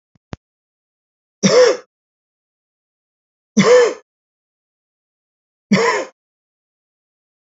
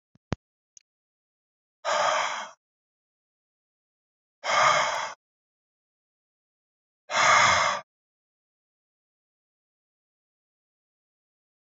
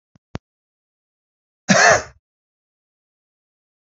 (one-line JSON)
{"three_cough_length": "7.6 s", "three_cough_amplitude": 28257, "three_cough_signal_mean_std_ratio": 0.3, "exhalation_length": "11.6 s", "exhalation_amplitude": 16815, "exhalation_signal_mean_std_ratio": 0.31, "cough_length": "3.9 s", "cough_amplitude": 28261, "cough_signal_mean_std_ratio": 0.23, "survey_phase": "beta (2021-08-13 to 2022-03-07)", "age": "45-64", "gender": "Male", "wearing_mask": "No", "symptom_none": true, "smoker_status": "Never smoked", "respiratory_condition_asthma": false, "respiratory_condition_other": false, "recruitment_source": "REACT", "submission_delay": "1 day", "covid_test_result": "Negative", "covid_test_method": "RT-qPCR"}